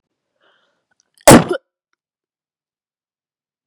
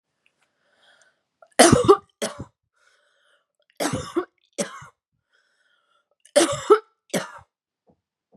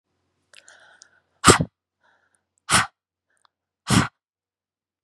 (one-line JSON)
{"cough_length": "3.7 s", "cough_amplitude": 32768, "cough_signal_mean_std_ratio": 0.19, "three_cough_length": "8.4 s", "three_cough_amplitude": 31372, "three_cough_signal_mean_std_ratio": 0.26, "exhalation_length": "5.0 s", "exhalation_amplitude": 32768, "exhalation_signal_mean_std_ratio": 0.23, "survey_phase": "beta (2021-08-13 to 2022-03-07)", "age": "18-44", "gender": "Female", "wearing_mask": "No", "symptom_cough_any": true, "symptom_runny_or_blocked_nose": true, "symptom_sore_throat": true, "symptom_fatigue": true, "symptom_headache": true, "symptom_onset": "3 days", "smoker_status": "Never smoked", "respiratory_condition_asthma": false, "respiratory_condition_other": false, "recruitment_source": "Test and Trace", "submission_delay": "1 day", "covid_test_result": "Positive", "covid_test_method": "RT-qPCR", "covid_ct_value": 18.8, "covid_ct_gene": "ORF1ab gene", "covid_ct_mean": 19.3, "covid_viral_load": "480000 copies/ml", "covid_viral_load_category": "Low viral load (10K-1M copies/ml)"}